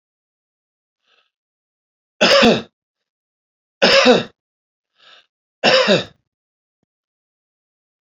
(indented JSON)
{
  "three_cough_length": "8.0 s",
  "three_cough_amplitude": 32767,
  "three_cough_signal_mean_std_ratio": 0.31,
  "survey_phase": "beta (2021-08-13 to 2022-03-07)",
  "age": "65+",
  "gender": "Male",
  "wearing_mask": "No",
  "symptom_cough_any": true,
  "symptom_runny_or_blocked_nose": true,
  "symptom_loss_of_taste": true,
  "symptom_onset": "4 days",
  "smoker_status": "Ex-smoker",
  "respiratory_condition_asthma": false,
  "respiratory_condition_other": false,
  "recruitment_source": "Test and Trace",
  "submission_delay": "2 days",
  "covid_test_result": "Positive",
  "covid_test_method": "RT-qPCR",
  "covid_ct_value": 13.5,
  "covid_ct_gene": "ORF1ab gene",
  "covid_ct_mean": 13.7,
  "covid_viral_load": "31000000 copies/ml",
  "covid_viral_load_category": "High viral load (>1M copies/ml)"
}